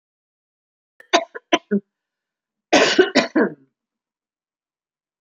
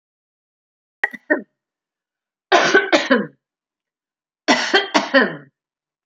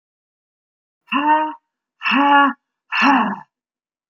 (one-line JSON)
{"cough_length": "5.2 s", "cough_amplitude": 28295, "cough_signal_mean_std_ratio": 0.3, "three_cough_length": "6.1 s", "three_cough_amplitude": 30701, "three_cough_signal_mean_std_ratio": 0.37, "exhalation_length": "4.1 s", "exhalation_amplitude": 26256, "exhalation_signal_mean_std_ratio": 0.48, "survey_phase": "beta (2021-08-13 to 2022-03-07)", "age": "45-64", "gender": "Female", "wearing_mask": "No", "symptom_none": true, "symptom_onset": "5 days", "smoker_status": "Never smoked", "respiratory_condition_asthma": false, "respiratory_condition_other": false, "recruitment_source": "REACT", "submission_delay": "2 days", "covid_test_result": "Negative", "covid_test_method": "RT-qPCR"}